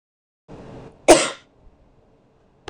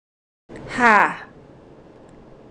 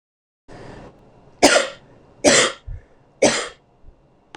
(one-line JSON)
{"cough_length": "2.7 s", "cough_amplitude": 26028, "cough_signal_mean_std_ratio": 0.22, "exhalation_length": "2.5 s", "exhalation_amplitude": 26028, "exhalation_signal_mean_std_ratio": 0.33, "three_cough_length": "4.4 s", "three_cough_amplitude": 26028, "three_cough_signal_mean_std_ratio": 0.35, "survey_phase": "beta (2021-08-13 to 2022-03-07)", "age": "18-44", "gender": "Female", "wearing_mask": "No", "symptom_sore_throat": true, "symptom_fatigue": true, "smoker_status": "Never smoked", "respiratory_condition_asthma": true, "respiratory_condition_other": false, "recruitment_source": "REACT", "submission_delay": "2 days", "covid_test_result": "Negative", "covid_test_method": "RT-qPCR"}